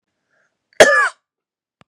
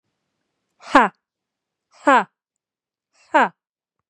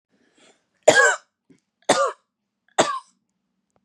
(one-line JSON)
{"cough_length": "1.9 s", "cough_amplitude": 32768, "cough_signal_mean_std_ratio": 0.29, "exhalation_length": "4.1 s", "exhalation_amplitude": 32767, "exhalation_signal_mean_std_ratio": 0.24, "three_cough_length": "3.8 s", "three_cough_amplitude": 32533, "three_cough_signal_mean_std_ratio": 0.31, "survey_phase": "beta (2021-08-13 to 2022-03-07)", "age": "18-44", "gender": "Female", "wearing_mask": "No", "symptom_runny_or_blocked_nose": true, "symptom_sore_throat": true, "symptom_fatigue": true, "symptom_onset": "4 days", "smoker_status": "Never smoked", "respiratory_condition_asthma": true, "respiratory_condition_other": false, "recruitment_source": "Test and Trace", "submission_delay": "1 day", "covid_test_result": "Negative", "covid_test_method": "RT-qPCR"}